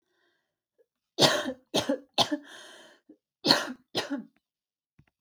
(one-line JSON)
{"cough_length": "5.2 s", "cough_amplitude": 25311, "cough_signal_mean_std_ratio": 0.34, "survey_phase": "alpha (2021-03-01 to 2021-08-12)", "age": "18-44", "gender": "Female", "wearing_mask": "No", "symptom_none": true, "smoker_status": "Never smoked", "respiratory_condition_asthma": false, "respiratory_condition_other": false, "recruitment_source": "REACT", "submission_delay": "1 day", "covid_test_result": "Negative", "covid_test_method": "RT-qPCR"}